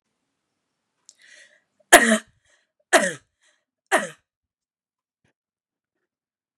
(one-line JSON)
{"three_cough_length": "6.6 s", "three_cough_amplitude": 32768, "three_cough_signal_mean_std_ratio": 0.2, "survey_phase": "beta (2021-08-13 to 2022-03-07)", "age": "18-44", "gender": "Female", "wearing_mask": "No", "symptom_none": true, "smoker_status": "Never smoked", "respiratory_condition_asthma": false, "respiratory_condition_other": false, "recruitment_source": "REACT", "submission_delay": "1 day", "covid_test_result": "Negative", "covid_test_method": "RT-qPCR", "influenza_a_test_result": "Negative", "influenza_b_test_result": "Negative"}